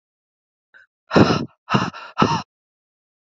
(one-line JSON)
{"exhalation_length": "3.2 s", "exhalation_amplitude": 27635, "exhalation_signal_mean_std_ratio": 0.35, "survey_phase": "alpha (2021-03-01 to 2021-08-12)", "age": "18-44", "gender": "Female", "wearing_mask": "No", "symptom_cough_any": true, "symptom_new_continuous_cough": true, "symptom_diarrhoea": true, "symptom_fatigue": true, "symptom_fever_high_temperature": true, "symptom_headache": true, "symptom_change_to_sense_of_smell_or_taste": true, "symptom_loss_of_taste": true, "symptom_onset": "4 days", "smoker_status": "Never smoked", "respiratory_condition_asthma": false, "respiratory_condition_other": false, "recruitment_source": "Test and Trace", "submission_delay": "2 days", "covid_test_result": "Positive", "covid_test_method": "RT-qPCR", "covid_ct_value": 21.4, "covid_ct_gene": "N gene", "covid_ct_mean": 21.5, "covid_viral_load": "91000 copies/ml", "covid_viral_load_category": "Low viral load (10K-1M copies/ml)"}